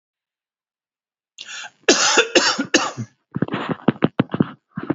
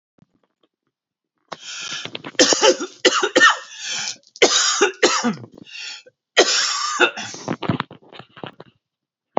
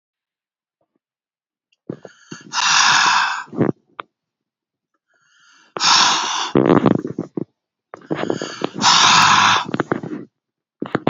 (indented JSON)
{
  "cough_length": "4.9 s",
  "cough_amplitude": 30503,
  "cough_signal_mean_std_ratio": 0.4,
  "three_cough_length": "9.4 s",
  "three_cough_amplitude": 32767,
  "three_cough_signal_mean_std_ratio": 0.45,
  "exhalation_length": "11.1 s",
  "exhalation_amplitude": 32767,
  "exhalation_signal_mean_std_ratio": 0.46,
  "survey_phase": "beta (2021-08-13 to 2022-03-07)",
  "age": "45-64",
  "gender": "Male",
  "wearing_mask": "No",
  "symptom_cough_any": true,
  "symptom_runny_or_blocked_nose": true,
  "symptom_sore_throat": true,
  "symptom_onset": "6 days",
  "smoker_status": "Current smoker (11 or more cigarettes per day)",
  "respiratory_condition_asthma": false,
  "respiratory_condition_other": false,
  "recruitment_source": "REACT",
  "submission_delay": "2 days",
  "covid_test_result": "Negative",
  "covid_test_method": "RT-qPCR"
}